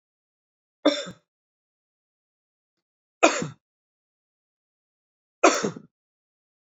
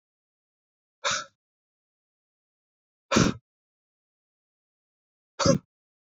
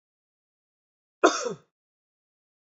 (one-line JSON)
{"three_cough_length": "6.7 s", "three_cough_amplitude": 31775, "three_cough_signal_mean_std_ratio": 0.21, "exhalation_length": "6.1 s", "exhalation_amplitude": 16818, "exhalation_signal_mean_std_ratio": 0.22, "cough_length": "2.6 s", "cough_amplitude": 26091, "cough_signal_mean_std_ratio": 0.2, "survey_phase": "beta (2021-08-13 to 2022-03-07)", "age": "45-64", "gender": "Male", "wearing_mask": "No", "symptom_fatigue": true, "symptom_headache": true, "symptom_onset": "5 days", "smoker_status": "Never smoked", "respiratory_condition_asthma": false, "respiratory_condition_other": false, "recruitment_source": "Test and Trace", "submission_delay": "2 days", "covid_test_result": "Positive", "covid_test_method": "ePCR"}